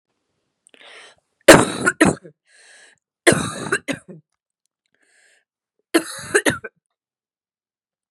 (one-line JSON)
{"three_cough_length": "8.1 s", "three_cough_amplitude": 32768, "three_cough_signal_mean_std_ratio": 0.26, "survey_phase": "beta (2021-08-13 to 2022-03-07)", "age": "18-44", "gender": "Female", "wearing_mask": "No", "symptom_new_continuous_cough": true, "symptom_sore_throat": true, "symptom_fatigue": true, "symptom_fever_high_temperature": true, "smoker_status": "Never smoked", "respiratory_condition_asthma": false, "respiratory_condition_other": false, "recruitment_source": "Test and Trace", "submission_delay": "1 day", "covid_test_result": "Positive", "covid_test_method": "RT-qPCR", "covid_ct_value": 30.5, "covid_ct_gene": "ORF1ab gene"}